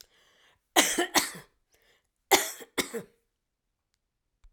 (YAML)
cough_length: 4.5 s
cough_amplitude: 21430
cough_signal_mean_std_ratio: 0.29
survey_phase: alpha (2021-03-01 to 2021-08-12)
age: 65+
gender: Female
wearing_mask: 'No'
symptom_none: true
smoker_status: Never smoked
respiratory_condition_asthma: false
respiratory_condition_other: false
recruitment_source: REACT
submission_delay: 1 day
covid_test_result: Negative
covid_test_method: RT-qPCR